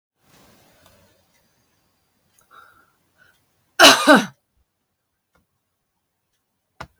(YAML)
cough_length: 7.0 s
cough_amplitude: 32660
cough_signal_mean_std_ratio: 0.19
survey_phase: beta (2021-08-13 to 2022-03-07)
age: 65+
gender: Female
wearing_mask: 'No'
symptom_none: true
smoker_status: Never smoked
respiratory_condition_asthma: false
respiratory_condition_other: false
recruitment_source: REACT
submission_delay: 1 day
covid_test_result: Negative
covid_test_method: RT-qPCR